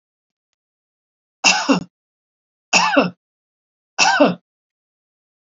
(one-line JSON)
{"three_cough_length": "5.5 s", "three_cough_amplitude": 32402, "three_cough_signal_mean_std_ratio": 0.34, "survey_phase": "beta (2021-08-13 to 2022-03-07)", "age": "65+", "gender": "Female", "wearing_mask": "No", "symptom_none": true, "smoker_status": "Ex-smoker", "respiratory_condition_asthma": false, "respiratory_condition_other": false, "recruitment_source": "REACT", "submission_delay": "1 day", "covid_test_result": "Negative", "covid_test_method": "RT-qPCR", "influenza_a_test_result": "Negative", "influenza_b_test_result": "Negative"}